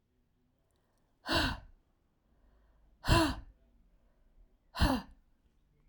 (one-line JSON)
{"exhalation_length": "5.9 s", "exhalation_amplitude": 7828, "exhalation_signal_mean_std_ratio": 0.31, "survey_phase": "alpha (2021-03-01 to 2021-08-12)", "age": "45-64", "gender": "Female", "wearing_mask": "No", "symptom_none": true, "smoker_status": "Never smoked", "respiratory_condition_asthma": false, "respiratory_condition_other": false, "recruitment_source": "REACT", "submission_delay": "1 day", "covid_test_result": "Negative", "covid_test_method": "RT-qPCR"}